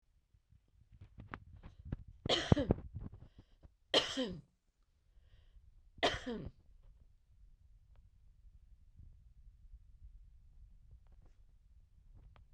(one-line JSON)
{"three_cough_length": "12.5 s", "three_cough_amplitude": 10379, "three_cough_signal_mean_std_ratio": 0.29, "survey_phase": "beta (2021-08-13 to 2022-03-07)", "age": "45-64", "gender": "Female", "wearing_mask": "No", "symptom_cough_any": true, "symptom_onset": "12 days", "smoker_status": "Never smoked", "respiratory_condition_asthma": false, "respiratory_condition_other": false, "recruitment_source": "REACT", "submission_delay": "1 day", "covid_test_result": "Negative", "covid_test_method": "RT-qPCR"}